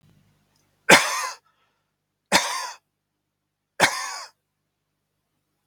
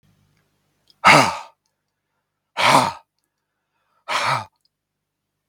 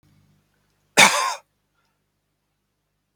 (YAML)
three_cough_length: 5.7 s
three_cough_amplitude: 32767
three_cough_signal_mean_std_ratio: 0.27
exhalation_length: 5.5 s
exhalation_amplitude: 32768
exhalation_signal_mean_std_ratio: 0.3
cough_length: 3.2 s
cough_amplitude: 32768
cough_signal_mean_std_ratio: 0.23
survey_phase: beta (2021-08-13 to 2022-03-07)
age: 65+
gender: Male
wearing_mask: 'No'
symptom_none: true
smoker_status: Never smoked
respiratory_condition_asthma: false
respiratory_condition_other: false
recruitment_source: REACT
submission_delay: 2 days
covid_test_result: Negative
covid_test_method: RT-qPCR